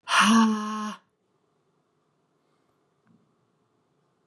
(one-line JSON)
{"exhalation_length": "4.3 s", "exhalation_amplitude": 14787, "exhalation_signal_mean_std_ratio": 0.33, "survey_phase": "beta (2021-08-13 to 2022-03-07)", "age": "18-44", "gender": "Female", "wearing_mask": "No", "symptom_none": true, "smoker_status": "Never smoked", "respiratory_condition_asthma": false, "respiratory_condition_other": false, "recruitment_source": "REACT", "submission_delay": "1 day", "covid_test_result": "Negative", "covid_test_method": "RT-qPCR", "influenza_a_test_result": "Unknown/Void", "influenza_b_test_result": "Unknown/Void"}